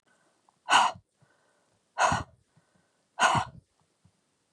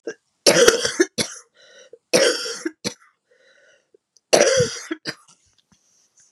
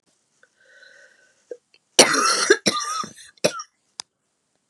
{
  "exhalation_length": "4.5 s",
  "exhalation_amplitude": 14196,
  "exhalation_signal_mean_std_ratio": 0.32,
  "three_cough_length": "6.3 s",
  "three_cough_amplitude": 32768,
  "three_cough_signal_mean_std_ratio": 0.38,
  "cough_length": "4.7 s",
  "cough_amplitude": 32768,
  "cough_signal_mean_std_ratio": 0.33,
  "survey_phase": "beta (2021-08-13 to 2022-03-07)",
  "age": "45-64",
  "gender": "Female",
  "wearing_mask": "No",
  "symptom_cough_any": true,
  "symptom_new_continuous_cough": true,
  "symptom_runny_or_blocked_nose": true,
  "symptom_shortness_of_breath": true,
  "symptom_sore_throat": true,
  "symptom_abdominal_pain": true,
  "symptom_fatigue": true,
  "symptom_fever_high_temperature": true,
  "symptom_headache": true,
  "symptom_other": true,
  "symptom_onset": "3 days",
  "smoker_status": "Ex-smoker",
  "respiratory_condition_asthma": true,
  "respiratory_condition_other": false,
  "recruitment_source": "Test and Trace",
  "submission_delay": "0 days",
  "covid_test_result": "Positive",
  "covid_test_method": "RT-qPCR",
  "covid_ct_value": 20.9,
  "covid_ct_gene": "N gene"
}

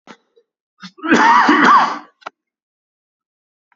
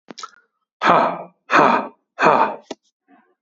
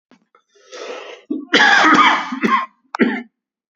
{
  "cough_length": "3.8 s",
  "cough_amplitude": 28827,
  "cough_signal_mean_std_ratio": 0.42,
  "exhalation_length": "3.4 s",
  "exhalation_amplitude": 31655,
  "exhalation_signal_mean_std_ratio": 0.44,
  "three_cough_length": "3.8 s",
  "three_cough_amplitude": 29921,
  "three_cough_signal_mean_std_ratio": 0.51,
  "survey_phase": "beta (2021-08-13 to 2022-03-07)",
  "age": "18-44",
  "gender": "Male",
  "wearing_mask": "No",
  "symptom_none": true,
  "smoker_status": "Never smoked",
  "respiratory_condition_asthma": true,
  "respiratory_condition_other": false,
  "recruitment_source": "REACT",
  "submission_delay": "0 days",
  "covid_test_result": "Negative",
  "covid_test_method": "RT-qPCR",
  "influenza_a_test_result": "Negative",
  "influenza_b_test_result": "Negative"
}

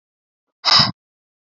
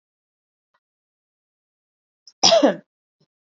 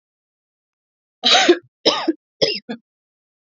{
  "exhalation_length": "1.5 s",
  "exhalation_amplitude": 28581,
  "exhalation_signal_mean_std_ratio": 0.31,
  "cough_length": "3.6 s",
  "cough_amplitude": 30032,
  "cough_signal_mean_std_ratio": 0.23,
  "three_cough_length": "3.5 s",
  "three_cough_amplitude": 31792,
  "three_cough_signal_mean_std_ratio": 0.35,
  "survey_phase": "beta (2021-08-13 to 2022-03-07)",
  "age": "18-44",
  "gender": "Female",
  "wearing_mask": "No",
  "symptom_none": true,
  "smoker_status": "Ex-smoker",
  "respiratory_condition_asthma": false,
  "respiratory_condition_other": false,
  "recruitment_source": "REACT",
  "submission_delay": "4 days",
  "covid_test_result": "Negative",
  "covid_test_method": "RT-qPCR",
  "influenza_a_test_result": "Negative",
  "influenza_b_test_result": "Negative"
}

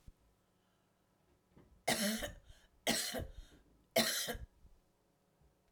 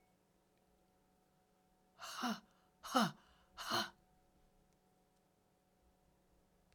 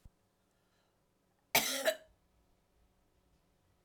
{
  "three_cough_length": "5.7 s",
  "three_cough_amplitude": 4207,
  "three_cough_signal_mean_std_ratio": 0.39,
  "exhalation_length": "6.7 s",
  "exhalation_amplitude": 3201,
  "exhalation_signal_mean_std_ratio": 0.27,
  "cough_length": "3.8 s",
  "cough_amplitude": 6366,
  "cough_signal_mean_std_ratio": 0.24,
  "survey_phase": "alpha (2021-03-01 to 2021-08-12)",
  "age": "65+",
  "gender": "Female",
  "wearing_mask": "No",
  "symptom_cough_any": true,
  "smoker_status": "Never smoked",
  "respiratory_condition_asthma": false,
  "respiratory_condition_other": false,
  "recruitment_source": "REACT",
  "submission_delay": "2 days",
  "covid_test_result": "Negative",
  "covid_test_method": "RT-qPCR"
}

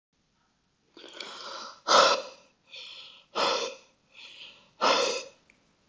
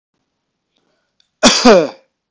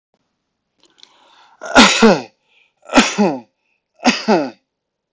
{
  "exhalation_length": "5.9 s",
  "exhalation_amplitude": 15646,
  "exhalation_signal_mean_std_ratio": 0.38,
  "cough_length": "2.3 s",
  "cough_amplitude": 32768,
  "cough_signal_mean_std_ratio": 0.35,
  "three_cough_length": "5.1 s",
  "three_cough_amplitude": 32768,
  "three_cough_signal_mean_std_ratio": 0.37,
  "survey_phase": "beta (2021-08-13 to 2022-03-07)",
  "age": "18-44",
  "gender": "Male",
  "wearing_mask": "No",
  "symptom_none": true,
  "smoker_status": "Never smoked",
  "respiratory_condition_asthma": false,
  "respiratory_condition_other": false,
  "recruitment_source": "REACT",
  "submission_delay": "1 day",
  "covid_test_result": "Negative",
  "covid_test_method": "RT-qPCR"
}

